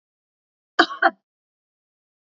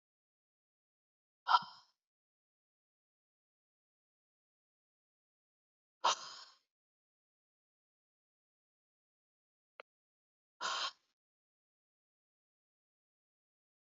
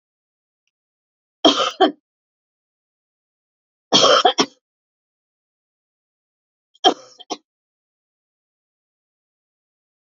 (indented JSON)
{
  "cough_length": "2.3 s",
  "cough_amplitude": 28073,
  "cough_signal_mean_std_ratio": 0.2,
  "exhalation_length": "13.8 s",
  "exhalation_amplitude": 6872,
  "exhalation_signal_mean_std_ratio": 0.14,
  "three_cough_length": "10.1 s",
  "three_cough_amplitude": 31177,
  "three_cough_signal_mean_std_ratio": 0.23,
  "survey_phase": "beta (2021-08-13 to 2022-03-07)",
  "age": "45-64",
  "gender": "Female",
  "wearing_mask": "No",
  "symptom_none": true,
  "symptom_onset": "6 days",
  "smoker_status": "Never smoked",
  "respiratory_condition_asthma": false,
  "respiratory_condition_other": false,
  "recruitment_source": "REACT",
  "submission_delay": "1 day",
  "covid_test_result": "Negative",
  "covid_test_method": "RT-qPCR",
  "influenza_a_test_result": "Negative",
  "influenza_b_test_result": "Negative"
}